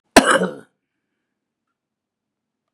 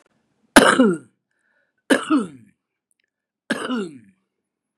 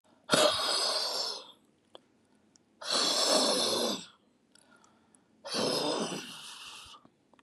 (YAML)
cough_length: 2.7 s
cough_amplitude: 32768
cough_signal_mean_std_ratio: 0.23
three_cough_length: 4.8 s
three_cough_amplitude: 32768
three_cough_signal_mean_std_ratio: 0.32
exhalation_length: 7.4 s
exhalation_amplitude: 12085
exhalation_signal_mean_std_ratio: 0.56
survey_phase: beta (2021-08-13 to 2022-03-07)
age: 65+
gender: Male
wearing_mask: 'No'
symptom_none: true
smoker_status: Ex-smoker
respiratory_condition_asthma: false
respiratory_condition_other: true
recruitment_source: REACT
submission_delay: 6 days
covid_test_result: Negative
covid_test_method: RT-qPCR
influenza_a_test_result: Negative
influenza_b_test_result: Negative